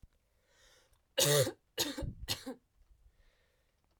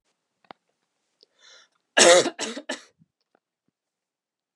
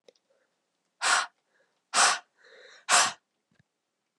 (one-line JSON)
{"three_cough_length": "4.0 s", "three_cough_amplitude": 6877, "three_cough_signal_mean_std_ratio": 0.35, "cough_length": "4.6 s", "cough_amplitude": 27520, "cough_signal_mean_std_ratio": 0.23, "exhalation_length": "4.2 s", "exhalation_amplitude": 15115, "exhalation_signal_mean_std_ratio": 0.32, "survey_phase": "alpha (2021-03-01 to 2021-08-12)", "age": "18-44", "gender": "Female", "wearing_mask": "No", "symptom_cough_any": true, "symptom_fatigue": true, "symptom_headache": true, "symptom_onset": "3 days", "smoker_status": "Never smoked", "respiratory_condition_asthma": false, "respiratory_condition_other": false, "recruitment_source": "Test and Trace", "submission_delay": "2 days", "covid_test_result": "Positive", "covid_test_method": "RT-qPCR", "covid_ct_value": 20.0, "covid_ct_gene": "ORF1ab gene", "covid_ct_mean": 20.7, "covid_viral_load": "160000 copies/ml", "covid_viral_load_category": "Low viral load (10K-1M copies/ml)"}